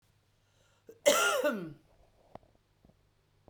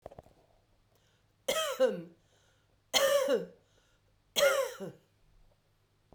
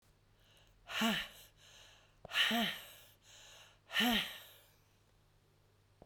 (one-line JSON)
{"cough_length": "3.5 s", "cough_amplitude": 10269, "cough_signal_mean_std_ratio": 0.33, "three_cough_length": "6.1 s", "three_cough_amplitude": 9151, "three_cough_signal_mean_std_ratio": 0.4, "exhalation_length": "6.1 s", "exhalation_amplitude": 3812, "exhalation_signal_mean_std_ratio": 0.4, "survey_phase": "beta (2021-08-13 to 2022-03-07)", "age": "65+", "gender": "Female", "wearing_mask": "No", "symptom_new_continuous_cough": true, "symptom_runny_or_blocked_nose": true, "symptom_onset": "5 days", "smoker_status": "Never smoked", "respiratory_condition_asthma": false, "respiratory_condition_other": false, "recruitment_source": "Test and Trace", "submission_delay": "2 days", "covid_test_result": "Positive", "covid_test_method": "RT-qPCR", "covid_ct_value": 17.9, "covid_ct_gene": "ORF1ab gene"}